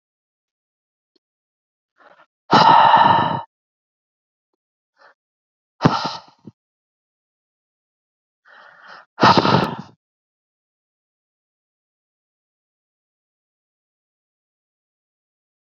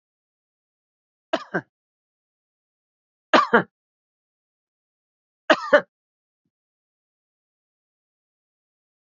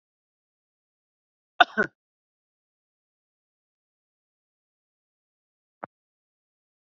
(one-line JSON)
{"exhalation_length": "15.6 s", "exhalation_amplitude": 28924, "exhalation_signal_mean_std_ratio": 0.25, "three_cough_length": "9.0 s", "three_cough_amplitude": 27635, "three_cough_signal_mean_std_ratio": 0.17, "cough_length": "6.8 s", "cough_amplitude": 28497, "cough_signal_mean_std_ratio": 0.08, "survey_phase": "beta (2021-08-13 to 2022-03-07)", "age": "45-64", "gender": "Male", "wearing_mask": "No", "symptom_none": true, "smoker_status": "Never smoked", "respiratory_condition_asthma": false, "respiratory_condition_other": false, "recruitment_source": "REACT", "submission_delay": "2 days", "covid_test_result": "Negative", "covid_test_method": "RT-qPCR"}